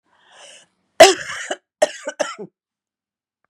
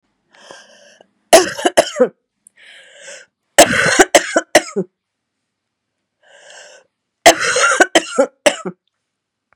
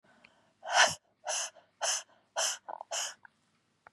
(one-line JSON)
{"cough_length": "3.5 s", "cough_amplitude": 32768, "cough_signal_mean_std_ratio": 0.24, "three_cough_length": "9.6 s", "three_cough_amplitude": 32768, "three_cough_signal_mean_std_ratio": 0.34, "exhalation_length": "3.9 s", "exhalation_amplitude": 12929, "exhalation_signal_mean_std_ratio": 0.39, "survey_phase": "beta (2021-08-13 to 2022-03-07)", "age": "45-64", "gender": "Female", "wearing_mask": "No", "symptom_cough_any": true, "symptom_runny_or_blocked_nose": true, "symptom_sore_throat": true, "symptom_diarrhoea": true, "symptom_headache": true, "symptom_change_to_sense_of_smell_or_taste": true, "symptom_onset": "3 days", "smoker_status": "Never smoked", "respiratory_condition_asthma": false, "respiratory_condition_other": false, "recruitment_source": "Test and Trace", "submission_delay": "2 days", "covid_test_result": "Positive", "covid_test_method": "ePCR"}